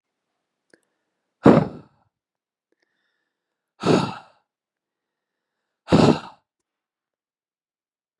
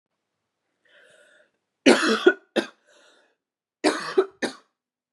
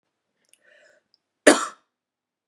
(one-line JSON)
{"exhalation_length": "8.2 s", "exhalation_amplitude": 32737, "exhalation_signal_mean_std_ratio": 0.22, "three_cough_length": "5.1 s", "three_cough_amplitude": 29443, "three_cough_signal_mean_std_ratio": 0.29, "cough_length": "2.5 s", "cough_amplitude": 32768, "cough_signal_mean_std_ratio": 0.18, "survey_phase": "beta (2021-08-13 to 2022-03-07)", "age": "18-44", "gender": "Female", "wearing_mask": "No", "symptom_cough_any": true, "symptom_runny_or_blocked_nose": true, "symptom_sore_throat": true, "symptom_fatigue": true, "symptom_onset": "3 days", "smoker_status": "Never smoked", "respiratory_condition_asthma": false, "respiratory_condition_other": false, "recruitment_source": "Test and Trace", "submission_delay": "2 days", "covid_test_result": "Positive", "covid_test_method": "RT-qPCR", "covid_ct_value": 21.7, "covid_ct_gene": "ORF1ab gene", "covid_ct_mean": 21.8, "covid_viral_load": "71000 copies/ml", "covid_viral_load_category": "Low viral load (10K-1M copies/ml)"}